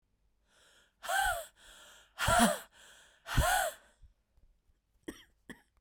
{"exhalation_length": "5.8 s", "exhalation_amplitude": 9000, "exhalation_signal_mean_std_ratio": 0.38, "survey_phase": "beta (2021-08-13 to 2022-03-07)", "age": "18-44", "gender": "Female", "wearing_mask": "No", "symptom_runny_or_blocked_nose": true, "symptom_sore_throat": true, "symptom_diarrhoea": true, "symptom_fatigue": true, "symptom_other": true, "symptom_onset": "5 days", "smoker_status": "Never smoked", "respiratory_condition_asthma": true, "respiratory_condition_other": false, "recruitment_source": "Test and Trace", "submission_delay": "1 day", "covid_test_result": "Positive", "covid_test_method": "RT-qPCR", "covid_ct_value": 20.8, "covid_ct_gene": "N gene"}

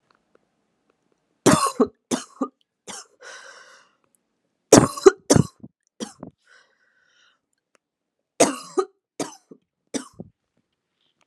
{"three_cough_length": "11.3 s", "three_cough_amplitude": 32768, "three_cough_signal_mean_std_ratio": 0.22, "survey_phase": "alpha (2021-03-01 to 2021-08-12)", "age": "18-44", "gender": "Female", "wearing_mask": "No", "symptom_cough_any": true, "symptom_shortness_of_breath": true, "symptom_fatigue": true, "symptom_change_to_sense_of_smell_or_taste": true, "symptom_loss_of_taste": true, "symptom_onset": "2 days", "smoker_status": "Ex-smoker", "respiratory_condition_asthma": false, "respiratory_condition_other": false, "recruitment_source": "Test and Trace", "submission_delay": "2 days", "covid_test_result": "Positive", "covid_test_method": "RT-qPCR", "covid_ct_value": 27.0, "covid_ct_gene": "ORF1ab gene", "covid_ct_mean": 27.4, "covid_viral_load": "990 copies/ml", "covid_viral_load_category": "Minimal viral load (< 10K copies/ml)"}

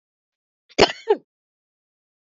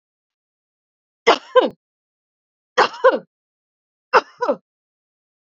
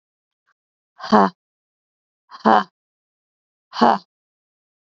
{"cough_length": "2.2 s", "cough_amplitude": 27442, "cough_signal_mean_std_ratio": 0.2, "three_cough_length": "5.5 s", "three_cough_amplitude": 28117, "three_cough_signal_mean_std_ratio": 0.26, "exhalation_length": "4.9 s", "exhalation_amplitude": 31461, "exhalation_signal_mean_std_ratio": 0.24, "survey_phase": "beta (2021-08-13 to 2022-03-07)", "age": "45-64", "gender": "Female", "wearing_mask": "No", "symptom_cough_any": true, "symptom_shortness_of_breath": true, "symptom_sore_throat": true, "symptom_abdominal_pain": true, "symptom_fatigue": true, "symptom_headache": true, "symptom_other": true, "symptom_onset": "6 days", "smoker_status": "Never smoked", "respiratory_condition_asthma": false, "respiratory_condition_other": true, "recruitment_source": "REACT", "submission_delay": "2 days", "covid_test_result": "Negative", "covid_test_method": "RT-qPCR", "influenza_a_test_result": "Negative", "influenza_b_test_result": "Negative"}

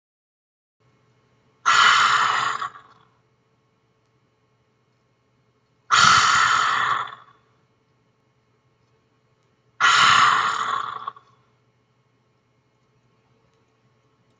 {"exhalation_length": "14.4 s", "exhalation_amplitude": 27733, "exhalation_signal_mean_std_ratio": 0.38, "survey_phase": "beta (2021-08-13 to 2022-03-07)", "age": "65+", "gender": "Female", "wearing_mask": "No", "symptom_none": true, "smoker_status": "Ex-smoker", "respiratory_condition_asthma": false, "respiratory_condition_other": true, "recruitment_source": "REACT", "submission_delay": "1 day", "covid_test_result": "Negative", "covid_test_method": "RT-qPCR", "influenza_a_test_result": "Negative", "influenza_b_test_result": "Negative"}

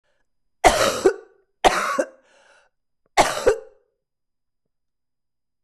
{"three_cough_length": "5.6 s", "three_cough_amplitude": 24367, "three_cough_signal_mean_std_ratio": 0.33, "survey_phase": "beta (2021-08-13 to 2022-03-07)", "age": "45-64", "gender": "Female", "wearing_mask": "No", "symptom_cough_any": true, "symptom_runny_or_blocked_nose": true, "symptom_abdominal_pain": true, "symptom_diarrhoea": true, "symptom_fatigue": true, "symptom_fever_high_temperature": true, "symptom_change_to_sense_of_smell_or_taste": true, "symptom_onset": "3 days", "smoker_status": "Ex-smoker", "respiratory_condition_asthma": false, "respiratory_condition_other": false, "recruitment_source": "Test and Trace", "submission_delay": "2 days", "covid_test_result": "Positive", "covid_test_method": "RT-qPCR"}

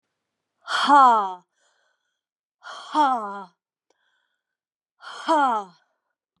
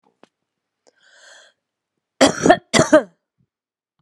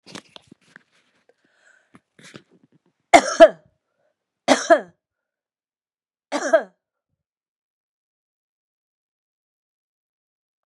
{"exhalation_length": "6.4 s", "exhalation_amplitude": 22048, "exhalation_signal_mean_std_ratio": 0.36, "cough_length": "4.0 s", "cough_amplitude": 32768, "cough_signal_mean_std_ratio": 0.26, "three_cough_length": "10.7 s", "three_cough_amplitude": 32768, "three_cough_signal_mean_std_ratio": 0.17, "survey_phase": "beta (2021-08-13 to 2022-03-07)", "age": "65+", "gender": "Female", "wearing_mask": "No", "symptom_runny_or_blocked_nose": true, "symptom_onset": "7 days", "smoker_status": "Ex-smoker", "respiratory_condition_asthma": false, "respiratory_condition_other": false, "recruitment_source": "REACT", "submission_delay": "6 days", "covid_test_result": "Positive", "covid_test_method": "RT-qPCR", "covid_ct_value": 25.0, "covid_ct_gene": "E gene", "influenza_a_test_result": "Negative", "influenza_b_test_result": "Negative"}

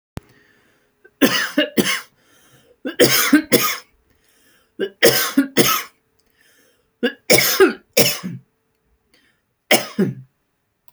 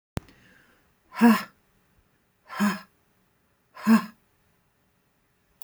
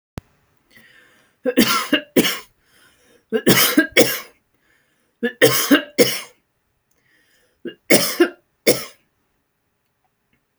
{"cough_length": "10.9 s", "cough_amplitude": 32768, "cough_signal_mean_std_ratio": 0.41, "exhalation_length": "5.6 s", "exhalation_amplitude": 16089, "exhalation_signal_mean_std_ratio": 0.26, "three_cough_length": "10.6 s", "three_cough_amplitude": 32768, "three_cough_signal_mean_std_ratio": 0.36, "survey_phase": "alpha (2021-03-01 to 2021-08-12)", "age": "45-64", "gender": "Female", "wearing_mask": "No", "symptom_none": true, "smoker_status": "Never smoked", "respiratory_condition_asthma": false, "respiratory_condition_other": false, "recruitment_source": "REACT", "submission_delay": "1 day", "covid_test_result": "Negative", "covid_test_method": "RT-qPCR"}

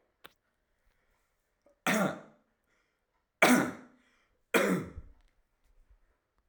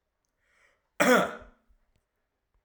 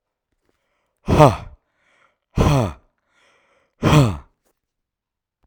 {"three_cough_length": "6.5 s", "three_cough_amplitude": 14474, "three_cough_signal_mean_std_ratio": 0.29, "cough_length": "2.6 s", "cough_amplitude": 14116, "cough_signal_mean_std_ratio": 0.27, "exhalation_length": "5.5 s", "exhalation_amplitude": 32768, "exhalation_signal_mean_std_ratio": 0.32, "survey_phase": "alpha (2021-03-01 to 2021-08-12)", "age": "45-64", "gender": "Male", "wearing_mask": "No", "symptom_none": true, "smoker_status": "Ex-smoker", "respiratory_condition_asthma": false, "respiratory_condition_other": false, "recruitment_source": "REACT", "submission_delay": "4 days", "covid_test_result": "Negative", "covid_test_method": "RT-qPCR"}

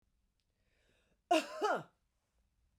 {"cough_length": "2.8 s", "cough_amplitude": 3906, "cough_signal_mean_std_ratio": 0.29, "survey_phase": "beta (2021-08-13 to 2022-03-07)", "age": "45-64", "gender": "Female", "wearing_mask": "No", "symptom_none": true, "symptom_onset": "4 days", "smoker_status": "Ex-smoker", "respiratory_condition_asthma": false, "respiratory_condition_other": false, "recruitment_source": "REACT", "submission_delay": "2 days", "covid_test_result": "Negative", "covid_test_method": "RT-qPCR", "influenza_a_test_result": "Negative", "influenza_b_test_result": "Negative"}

